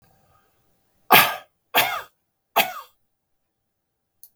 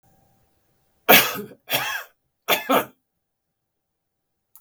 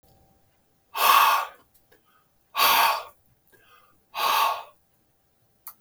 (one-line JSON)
{"cough_length": "4.4 s", "cough_amplitude": 32767, "cough_signal_mean_std_ratio": 0.26, "three_cough_length": "4.6 s", "three_cough_amplitude": 32768, "three_cough_signal_mean_std_ratio": 0.29, "exhalation_length": "5.8 s", "exhalation_amplitude": 19966, "exhalation_signal_mean_std_ratio": 0.4, "survey_phase": "beta (2021-08-13 to 2022-03-07)", "age": "65+", "gender": "Male", "wearing_mask": "No", "symptom_runny_or_blocked_nose": true, "smoker_status": "Never smoked", "respiratory_condition_asthma": false, "respiratory_condition_other": false, "recruitment_source": "REACT", "submission_delay": "1 day", "covid_test_result": "Negative", "covid_test_method": "RT-qPCR"}